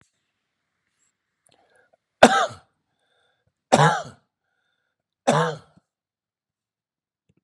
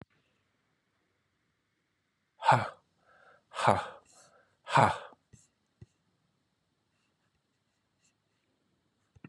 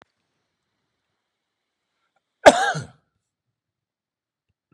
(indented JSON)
{
  "three_cough_length": "7.4 s",
  "three_cough_amplitude": 32768,
  "three_cough_signal_mean_std_ratio": 0.23,
  "exhalation_length": "9.3 s",
  "exhalation_amplitude": 13214,
  "exhalation_signal_mean_std_ratio": 0.21,
  "cough_length": "4.7 s",
  "cough_amplitude": 32768,
  "cough_signal_mean_std_ratio": 0.15,
  "survey_phase": "beta (2021-08-13 to 2022-03-07)",
  "age": "65+",
  "gender": "Male",
  "wearing_mask": "No",
  "symptom_none": true,
  "smoker_status": "Never smoked",
  "respiratory_condition_asthma": false,
  "respiratory_condition_other": false,
  "recruitment_source": "REACT",
  "submission_delay": "3 days",
  "covid_test_result": "Negative",
  "covid_test_method": "RT-qPCR",
  "influenza_a_test_result": "Negative",
  "influenza_b_test_result": "Negative"
}